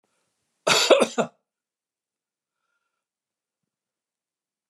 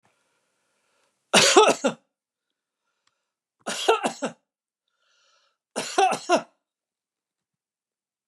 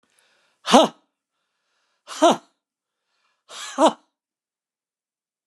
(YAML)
cough_length: 4.7 s
cough_amplitude: 27267
cough_signal_mean_std_ratio: 0.23
three_cough_length: 8.3 s
three_cough_amplitude: 29086
three_cough_signal_mean_std_ratio: 0.29
exhalation_length: 5.5 s
exhalation_amplitude: 32763
exhalation_signal_mean_std_ratio: 0.23
survey_phase: beta (2021-08-13 to 2022-03-07)
age: 65+
gender: Male
wearing_mask: 'No'
symptom_none: true
smoker_status: Never smoked
respiratory_condition_asthma: false
respiratory_condition_other: false
recruitment_source: REACT
submission_delay: 8 days
covid_test_result: Negative
covid_test_method: RT-qPCR
influenza_a_test_result: Negative
influenza_b_test_result: Negative